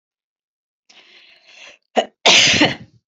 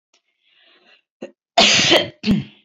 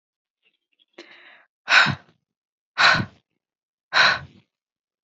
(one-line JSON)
{"three_cough_length": "3.1 s", "three_cough_amplitude": 32143, "three_cough_signal_mean_std_ratio": 0.35, "cough_length": "2.6 s", "cough_amplitude": 28789, "cough_signal_mean_std_ratio": 0.42, "exhalation_length": "5.0 s", "exhalation_amplitude": 25310, "exhalation_signal_mean_std_ratio": 0.31, "survey_phase": "beta (2021-08-13 to 2022-03-07)", "age": "45-64", "gender": "Female", "wearing_mask": "No", "symptom_none": true, "smoker_status": "Ex-smoker", "respiratory_condition_asthma": false, "respiratory_condition_other": false, "recruitment_source": "REACT", "submission_delay": "1 day", "covid_test_result": "Negative", "covid_test_method": "RT-qPCR", "influenza_a_test_result": "Negative", "influenza_b_test_result": "Negative"}